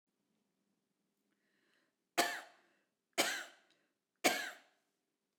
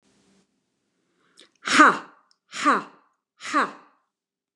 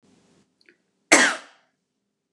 three_cough_length: 5.4 s
three_cough_amplitude: 6372
three_cough_signal_mean_std_ratio: 0.26
exhalation_length: 4.6 s
exhalation_amplitude: 28246
exhalation_signal_mean_std_ratio: 0.29
cough_length: 2.3 s
cough_amplitude: 29203
cough_signal_mean_std_ratio: 0.24
survey_phase: beta (2021-08-13 to 2022-03-07)
age: 45-64
gender: Female
wearing_mask: 'No'
symptom_none: true
symptom_onset: 9 days
smoker_status: Never smoked
respiratory_condition_asthma: false
respiratory_condition_other: false
recruitment_source: REACT
submission_delay: 1 day
covid_test_result: Negative
covid_test_method: RT-qPCR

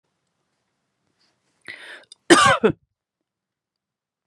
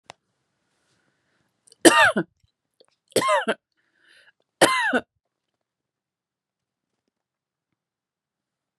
cough_length: 4.3 s
cough_amplitude: 32764
cough_signal_mean_std_ratio: 0.23
three_cough_length: 8.8 s
three_cough_amplitude: 32767
three_cough_signal_mean_std_ratio: 0.25
survey_phase: beta (2021-08-13 to 2022-03-07)
age: 18-44
gender: Female
wearing_mask: 'No'
symptom_none: true
smoker_status: Never smoked
respiratory_condition_asthma: false
respiratory_condition_other: false
recruitment_source: REACT
submission_delay: 3 days
covid_test_result: Negative
covid_test_method: RT-qPCR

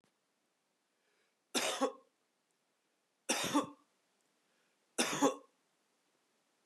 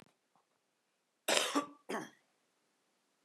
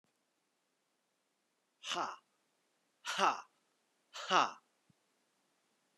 three_cough_length: 6.7 s
three_cough_amplitude: 5649
three_cough_signal_mean_std_ratio: 0.3
cough_length: 3.2 s
cough_amplitude: 9873
cough_signal_mean_std_ratio: 0.29
exhalation_length: 6.0 s
exhalation_amplitude: 6145
exhalation_signal_mean_std_ratio: 0.25
survey_phase: beta (2021-08-13 to 2022-03-07)
age: 45-64
gender: Male
wearing_mask: 'No'
symptom_cough_any: true
symptom_runny_or_blocked_nose: true
symptom_sore_throat: true
symptom_onset: 2 days
smoker_status: Never smoked
respiratory_condition_asthma: false
respiratory_condition_other: false
recruitment_source: Test and Trace
submission_delay: 1 day
covid_test_result: Positive
covid_test_method: RT-qPCR
covid_ct_value: 17.4
covid_ct_gene: N gene
covid_ct_mean: 17.5
covid_viral_load: 1800000 copies/ml
covid_viral_load_category: High viral load (>1M copies/ml)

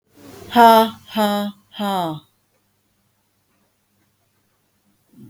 exhalation_length: 5.3 s
exhalation_amplitude: 32768
exhalation_signal_mean_std_ratio: 0.32
survey_phase: beta (2021-08-13 to 2022-03-07)
age: 65+
gender: Female
wearing_mask: 'No'
symptom_none: true
smoker_status: Never smoked
respiratory_condition_asthma: false
respiratory_condition_other: false
recruitment_source: REACT
submission_delay: 2 days
covid_test_result: Negative
covid_test_method: RT-qPCR
influenza_a_test_result: Negative
influenza_b_test_result: Negative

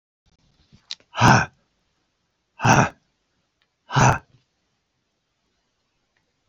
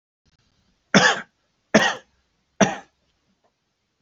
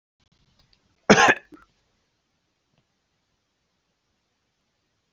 exhalation_length: 6.5 s
exhalation_amplitude: 28568
exhalation_signal_mean_std_ratio: 0.27
three_cough_length: 4.0 s
three_cough_amplitude: 30757
three_cough_signal_mean_std_ratio: 0.28
cough_length: 5.1 s
cough_amplitude: 29063
cough_signal_mean_std_ratio: 0.17
survey_phase: beta (2021-08-13 to 2022-03-07)
age: 65+
gender: Male
wearing_mask: 'No'
symptom_none: true
smoker_status: Never smoked
respiratory_condition_asthma: false
respiratory_condition_other: false
recruitment_source: REACT
submission_delay: 1 day
covid_test_result: Negative
covid_test_method: RT-qPCR
influenza_a_test_result: Negative
influenza_b_test_result: Negative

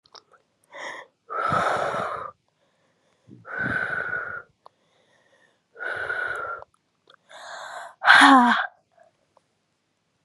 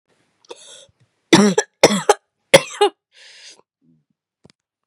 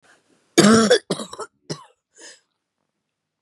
exhalation_length: 10.2 s
exhalation_amplitude: 31807
exhalation_signal_mean_std_ratio: 0.36
three_cough_length: 4.9 s
three_cough_amplitude: 32768
three_cough_signal_mean_std_ratio: 0.27
cough_length: 3.4 s
cough_amplitude: 32580
cough_signal_mean_std_ratio: 0.32
survey_phase: beta (2021-08-13 to 2022-03-07)
age: 18-44
gender: Female
wearing_mask: 'No'
symptom_cough_any: true
symptom_new_continuous_cough: true
symptom_runny_or_blocked_nose: true
symptom_shortness_of_breath: true
symptom_sore_throat: true
symptom_abdominal_pain: true
symptom_fatigue: true
symptom_fever_high_temperature: true
symptom_headache: true
symptom_change_to_sense_of_smell_or_taste: true
symptom_loss_of_taste: true
symptom_other: true
smoker_status: Ex-smoker
respiratory_condition_asthma: true
respiratory_condition_other: false
recruitment_source: Test and Trace
submission_delay: 2 days
covid_test_result: Positive
covid_test_method: LFT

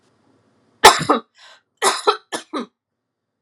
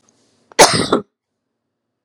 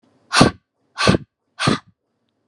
three_cough_length: 3.4 s
three_cough_amplitude: 32768
three_cough_signal_mean_std_ratio: 0.29
cough_length: 2.0 s
cough_amplitude: 32768
cough_signal_mean_std_ratio: 0.3
exhalation_length: 2.5 s
exhalation_amplitude: 32768
exhalation_signal_mean_std_ratio: 0.35
survey_phase: alpha (2021-03-01 to 2021-08-12)
age: 45-64
gender: Female
wearing_mask: 'No'
symptom_diarrhoea: true
symptom_fatigue: true
smoker_status: Never smoked
respiratory_condition_asthma: false
respiratory_condition_other: false
recruitment_source: REACT
submission_delay: 2 days
covid_test_result: Negative
covid_test_method: RT-qPCR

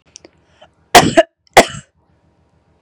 cough_length: 2.8 s
cough_amplitude: 32768
cough_signal_mean_std_ratio: 0.27
survey_phase: beta (2021-08-13 to 2022-03-07)
age: 18-44
gender: Female
wearing_mask: 'No'
symptom_none: true
smoker_status: Current smoker (1 to 10 cigarettes per day)
respiratory_condition_asthma: false
respiratory_condition_other: false
recruitment_source: REACT
submission_delay: 2 days
covid_test_result: Negative
covid_test_method: RT-qPCR
influenza_a_test_result: Negative
influenza_b_test_result: Negative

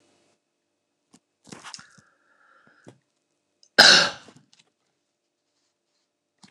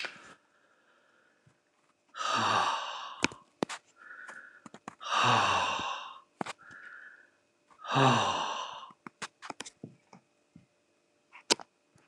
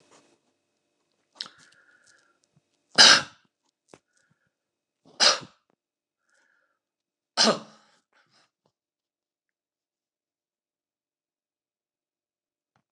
cough_length: 6.5 s
cough_amplitude: 29204
cough_signal_mean_std_ratio: 0.18
exhalation_length: 12.1 s
exhalation_amplitude: 17377
exhalation_signal_mean_std_ratio: 0.41
three_cough_length: 12.9 s
three_cough_amplitude: 28895
three_cough_signal_mean_std_ratio: 0.16
survey_phase: alpha (2021-03-01 to 2021-08-12)
age: 65+
gender: Male
wearing_mask: 'No'
symptom_none: true
smoker_status: Ex-smoker
respiratory_condition_asthma: false
respiratory_condition_other: false
recruitment_source: REACT
submission_delay: 1 day
covid_test_result: Negative
covid_test_method: RT-qPCR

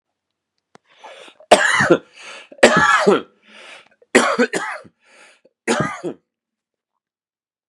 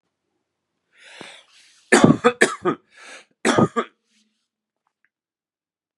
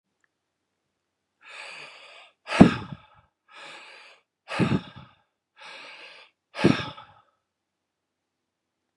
cough_length: 7.7 s
cough_amplitude: 32768
cough_signal_mean_std_ratio: 0.37
three_cough_length: 6.0 s
three_cough_amplitude: 32768
three_cough_signal_mean_std_ratio: 0.28
exhalation_length: 9.0 s
exhalation_amplitude: 32767
exhalation_signal_mean_std_ratio: 0.22
survey_phase: beta (2021-08-13 to 2022-03-07)
age: 45-64
gender: Male
wearing_mask: 'No'
symptom_runny_or_blocked_nose: true
symptom_fatigue: true
smoker_status: Ex-smoker
respiratory_condition_asthma: false
respiratory_condition_other: false
recruitment_source: Test and Trace
submission_delay: 2 days
covid_test_result: Positive
covid_test_method: LFT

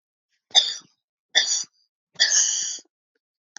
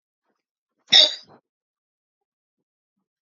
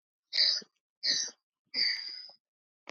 three_cough_length: 3.6 s
three_cough_amplitude: 27139
three_cough_signal_mean_std_ratio: 0.39
cough_length: 3.3 s
cough_amplitude: 32768
cough_signal_mean_std_ratio: 0.18
exhalation_length: 2.9 s
exhalation_amplitude: 6567
exhalation_signal_mean_std_ratio: 0.45
survey_phase: beta (2021-08-13 to 2022-03-07)
age: 45-64
gender: Female
wearing_mask: 'No'
symptom_cough_any: true
symptom_runny_or_blocked_nose: true
symptom_fatigue: true
symptom_fever_high_temperature: true
symptom_headache: true
symptom_change_to_sense_of_smell_or_taste: true
symptom_onset: 3 days
smoker_status: Never smoked
respiratory_condition_asthma: false
respiratory_condition_other: false
recruitment_source: Test and Trace
submission_delay: 1 day
covid_test_result: Positive
covid_test_method: RT-qPCR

